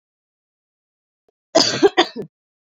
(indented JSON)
{
  "cough_length": "2.6 s",
  "cough_amplitude": 29869,
  "cough_signal_mean_std_ratio": 0.29,
  "survey_phase": "beta (2021-08-13 to 2022-03-07)",
  "age": "18-44",
  "gender": "Female",
  "wearing_mask": "No",
  "symptom_none": true,
  "smoker_status": "Current smoker (1 to 10 cigarettes per day)",
  "respiratory_condition_asthma": false,
  "respiratory_condition_other": false,
  "recruitment_source": "REACT",
  "submission_delay": "3 days",
  "covid_test_result": "Negative",
  "covid_test_method": "RT-qPCR"
}